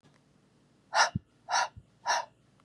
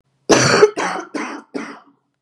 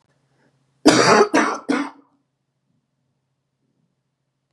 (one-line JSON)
{"exhalation_length": "2.6 s", "exhalation_amplitude": 9430, "exhalation_signal_mean_std_ratio": 0.37, "three_cough_length": "2.2 s", "three_cough_amplitude": 32767, "three_cough_signal_mean_std_ratio": 0.47, "cough_length": "4.5 s", "cough_amplitude": 32767, "cough_signal_mean_std_ratio": 0.33, "survey_phase": "beta (2021-08-13 to 2022-03-07)", "age": "45-64", "gender": "Female", "wearing_mask": "No", "symptom_cough_any": true, "symptom_runny_or_blocked_nose": true, "symptom_sore_throat": true, "symptom_diarrhoea": true, "symptom_fatigue": true, "symptom_fever_high_temperature": true, "symptom_headache": true, "symptom_other": true, "smoker_status": "Never smoked", "respiratory_condition_asthma": false, "respiratory_condition_other": false, "recruitment_source": "Test and Trace", "submission_delay": "1 day", "covid_test_result": "Positive", "covid_test_method": "LFT"}